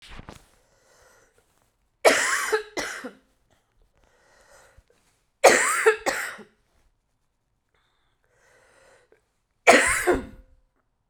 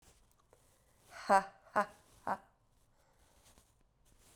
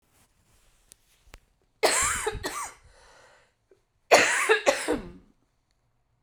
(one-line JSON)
{"three_cough_length": "11.1 s", "three_cough_amplitude": 32767, "three_cough_signal_mean_std_ratio": 0.3, "exhalation_length": "4.4 s", "exhalation_amplitude": 6638, "exhalation_signal_mean_std_ratio": 0.22, "cough_length": "6.2 s", "cough_amplitude": 28603, "cough_signal_mean_std_ratio": 0.36, "survey_phase": "beta (2021-08-13 to 2022-03-07)", "age": "18-44", "gender": "Female", "wearing_mask": "No", "symptom_cough_any": true, "symptom_runny_or_blocked_nose": true, "symptom_sore_throat": true, "symptom_fatigue": true, "symptom_fever_high_temperature": true, "symptom_headache": true, "symptom_onset": "3 days", "smoker_status": "Never smoked", "respiratory_condition_asthma": false, "respiratory_condition_other": false, "recruitment_source": "Test and Trace", "submission_delay": "1 day", "covid_test_result": "Positive", "covid_test_method": "ePCR"}